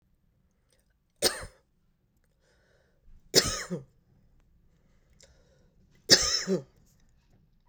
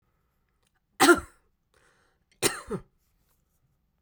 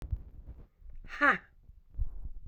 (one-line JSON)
{"three_cough_length": "7.7 s", "three_cough_amplitude": 21738, "three_cough_signal_mean_std_ratio": 0.25, "cough_length": "4.0 s", "cough_amplitude": 16918, "cough_signal_mean_std_ratio": 0.22, "exhalation_length": "2.5 s", "exhalation_amplitude": 8427, "exhalation_signal_mean_std_ratio": 0.47, "survey_phase": "beta (2021-08-13 to 2022-03-07)", "age": "45-64", "gender": "Female", "wearing_mask": "No", "symptom_cough_any": true, "symptom_runny_or_blocked_nose": true, "symptom_shortness_of_breath": true, "symptom_sore_throat": true, "symptom_fatigue": true, "symptom_headache": true, "symptom_onset": "3 days", "smoker_status": "Never smoked", "respiratory_condition_asthma": true, "respiratory_condition_other": false, "recruitment_source": "Test and Trace", "submission_delay": "2 days", "covid_test_result": "Positive", "covid_test_method": "RT-qPCR", "covid_ct_value": 17.6, "covid_ct_gene": "ORF1ab gene", "covid_ct_mean": 17.8, "covid_viral_load": "1400000 copies/ml", "covid_viral_load_category": "High viral load (>1M copies/ml)"}